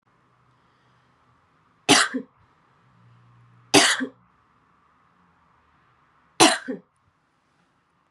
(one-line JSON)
{"three_cough_length": "8.1 s", "three_cough_amplitude": 32610, "three_cough_signal_mean_std_ratio": 0.23, "survey_phase": "beta (2021-08-13 to 2022-03-07)", "age": "18-44", "gender": "Female", "wearing_mask": "No", "symptom_runny_or_blocked_nose": true, "symptom_sore_throat": true, "symptom_abdominal_pain": true, "symptom_fatigue": true, "symptom_headache": true, "symptom_onset": "4 days", "smoker_status": "Never smoked", "respiratory_condition_asthma": true, "respiratory_condition_other": false, "recruitment_source": "REACT", "submission_delay": "2 days", "covid_test_result": "Negative", "covid_test_method": "RT-qPCR", "influenza_a_test_result": "Unknown/Void", "influenza_b_test_result": "Unknown/Void"}